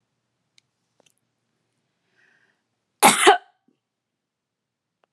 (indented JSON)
{
  "cough_length": "5.1 s",
  "cough_amplitude": 32248,
  "cough_signal_mean_std_ratio": 0.19,
  "survey_phase": "beta (2021-08-13 to 2022-03-07)",
  "age": "18-44",
  "gender": "Female",
  "wearing_mask": "No",
  "symptom_none": true,
  "smoker_status": "Never smoked",
  "respiratory_condition_asthma": false,
  "respiratory_condition_other": false,
  "recruitment_source": "REACT",
  "submission_delay": "2 days",
  "covid_test_result": "Negative",
  "covid_test_method": "RT-qPCR"
}